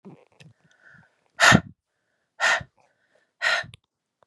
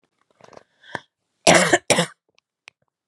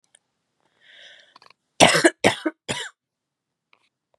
exhalation_length: 4.3 s
exhalation_amplitude: 25860
exhalation_signal_mean_std_ratio: 0.28
cough_length: 3.1 s
cough_amplitude: 32753
cough_signal_mean_std_ratio: 0.29
three_cough_length: 4.2 s
three_cough_amplitude: 32768
three_cough_signal_mean_std_ratio: 0.25
survey_phase: beta (2021-08-13 to 2022-03-07)
age: 18-44
gender: Female
wearing_mask: 'No'
symptom_cough_any: true
symptom_runny_or_blocked_nose: true
symptom_sore_throat: true
symptom_fatigue: true
symptom_fever_high_temperature: true
symptom_headache: true
symptom_onset: 2 days
smoker_status: Never smoked
respiratory_condition_asthma: false
respiratory_condition_other: false
recruitment_source: Test and Trace
submission_delay: 1 day
covid_test_result: Positive
covid_test_method: RT-qPCR
covid_ct_value: 26.0
covid_ct_gene: ORF1ab gene
covid_ct_mean: 26.5
covid_viral_load: 2100 copies/ml
covid_viral_load_category: Minimal viral load (< 10K copies/ml)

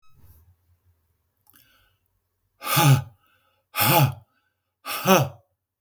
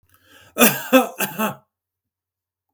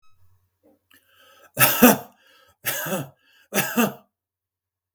exhalation_length: 5.8 s
exhalation_amplitude: 29060
exhalation_signal_mean_std_ratio: 0.34
cough_length: 2.7 s
cough_amplitude: 32768
cough_signal_mean_std_ratio: 0.34
three_cough_length: 4.9 s
three_cough_amplitude: 32768
three_cough_signal_mean_std_ratio: 0.32
survey_phase: beta (2021-08-13 to 2022-03-07)
age: 45-64
gender: Male
wearing_mask: 'No'
symptom_none: true
smoker_status: Never smoked
respiratory_condition_asthma: false
respiratory_condition_other: false
recruitment_source: REACT
submission_delay: 1 day
covid_test_result: Negative
covid_test_method: RT-qPCR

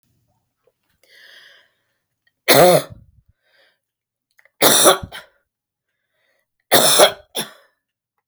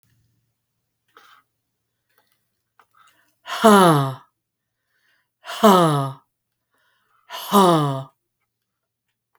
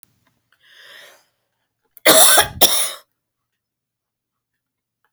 three_cough_length: 8.3 s
three_cough_amplitude: 32768
three_cough_signal_mean_std_ratio: 0.3
exhalation_length: 9.4 s
exhalation_amplitude: 32767
exhalation_signal_mean_std_ratio: 0.32
cough_length: 5.1 s
cough_amplitude: 32768
cough_signal_mean_std_ratio: 0.29
survey_phase: beta (2021-08-13 to 2022-03-07)
age: 65+
gender: Female
wearing_mask: 'No'
symptom_cough_any: true
smoker_status: Never smoked
respiratory_condition_asthma: true
respiratory_condition_other: false
recruitment_source: REACT
submission_delay: 1 day
covid_test_result: Negative
covid_test_method: RT-qPCR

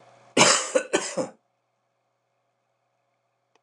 cough_length: 3.6 s
cough_amplitude: 25500
cough_signal_mean_std_ratio: 0.31
survey_phase: beta (2021-08-13 to 2022-03-07)
age: 65+
gender: Male
wearing_mask: 'No'
symptom_cough_any: true
symptom_runny_or_blocked_nose: true
symptom_headache: true
symptom_change_to_sense_of_smell_or_taste: true
smoker_status: Never smoked
respiratory_condition_asthma: false
respiratory_condition_other: false
recruitment_source: Test and Trace
submission_delay: 2 days
covid_test_result: Positive
covid_test_method: RT-qPCR
covid_ct_value: 29.5
covid_ct_gene: ORF1ab gene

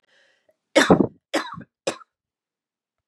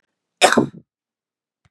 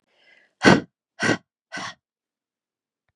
three_cough_length: 3.1 s
three_cough_amplitude: 26565
three_cough_signal_mean_std_ratio: 0.27
cough_length: 1.7 s
cough_amplitude: 32735
cough_signal_mean_std_ratio: 0.27
exhalation_length: 3.2 s
exhalation_amplitude: 32767
exhalation_signal_mean_std_ratio: 0.25
survey_phase: beta (2021-08-13 to 2022-03-07)
age: 45-64
gender: Female
wearing_mask: 'No'
symptom_cough_any: true
symptom_new_continuous_cough: true
symptom_runny_or_blocked_nose: true
symptom_sore_throat: true
symptom_fever_high_temperature: true
symptom_onset: 3 days
smoker_status: Ex-smoker
respiratory_condition_asthma: false
respiratory_condition_other: false
recruitment_source: Test and Trace
submission_delay: 1 day
covid_test_result: Positive
covid_test_method: RT-qPCR
covid_ct_value: 29.2
covid_ct_gene: ORF1ab gene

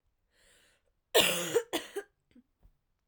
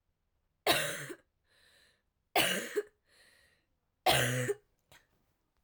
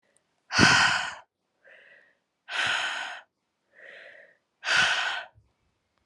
cough_length: 3.1 s
cough_amplitude: 12511
cough_signal_mean_std_ratio: 0.32
three_cough_length: 5.6 s
three_cough_amplitude: 8521
three_cough_signal_mean_std_ratio: 0.37
exhalation_length: 6.1 s
exhalation_amplitude: 21113
exhalation_signal_mean_std_ratio: 0.41
survey_phase: alpha (2021-03-01 to 2021-08-12)
age: 18-44
gender: Female
wearing_mask: 'No'
symptom_cough_any: true
symptom_new_continuous_cough: true
symptom_shortness_of_breath: true
symptom_fatigue: true
symptom_fever_high_temperature: true
symptom_headache: true
symptom_change_to_sense_of_smell_or_taste: true
symptom_loss_of_taste: true
symptom_onset: 3 days
smoker_status: Never smoked
respiratory_condition_asthma: true
respiratory_condition_other: false
recruitment_source: Test and Trace
submission_delay: 2 days
covid_test_result: Positive
covid_test_method: RT-qPCR
covid_ct_value: 20.8
covid_ct_gene: ORF1ab gene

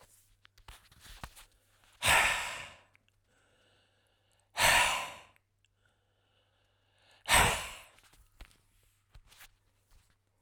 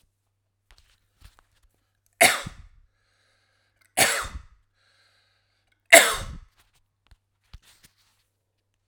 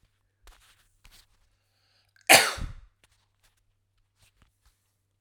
exhalation_length: 10.4 s
exhalation_amplitude: 8992
exhalation_signal_mean_std_ratio: 0.3
three_cough_length: 8.9 s
three_cough_amplitude: 32768
three_cough_signal_mean_std_ratio: 0.2
cough_length: 5.2 s
cough_amplitude: 31709
cough_signal_mean_std_ratio: 0.17
survey_phase: alpha (2021-03-01 to 2021-08-12)
age: 45-64
gender: Male
wearing_mask: 'No'
symptom_none: true
symptom_onset: 7 days
smoker_status: Never smoked
respiratory_condition_asthma: false
respiratory_condition_other: false
recruitment_source: REACT
submission_delay: 1 day
covid_test_result: Negative
covid_test_method: RT-qPCR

